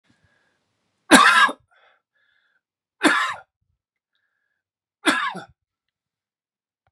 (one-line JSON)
{"three_cough_length": "6.9 s", "three_cough_amplitude": 32767, "three_cough_signal_mean_std_ratio": 0.27, "survey_phase": "beta (2021-08-13 to 2022-03-07)", "age": "45-64", "gender": "Male", "wearing_mask": "No", "symptom_cough_any": true, "symptom_runny_or_blocked_nose": true, "symptom_fatigue": true, "symptom_onset": "4 days", "smoker_status": "Ex-smoker", "respiratory_condition_asthma": false, "respiratory_condition_other": false, "recruitment_source": "Test and Trace", "submission_delay": "2 days", "covid_test_result": "Positive", "covid_test_method": "RT-qPCR"}